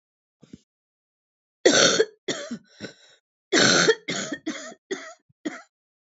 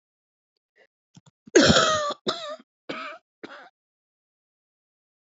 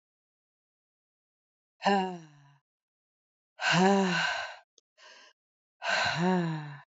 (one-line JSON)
{"three_cough_length": "6.1 s", "three_cough_amplitude": 22264, "three_cough_signal_mean_std_ratio": 0.37, "cough_length": "5.4 s", "cough_amplitude": 23212, "cough_signal_mean_std_ratio": 0.29, "exhalation_length": "7.0 s", "exhalation_amplitude": 9205, "exhalation_signal_mean_std_ratio": 0.44, "survey_phase": "alpha (2021-03-01 to 2021-08-12)", "age": "45-64", "gender": "Female", "wearing_mask": "No", "symptom_cough_any": true, "symptom_new_continuous_cough": true, "symptom_shortness_of_breath": true, "symptom_fatigue": true, "symptom_headache": true, "symptom_change_to_sense_of_smell_or_taste": true, "symptom_loss_of_taste": true, "symptom_onset": "5 days", "smoker_status": "Current smoker (e-cigarettes or vapes only)", "respiratory_condition_asthma": false, "respiratory_condition_other": false, "recruitment_source": "Test and Trace", "submission_delay": "2 days"}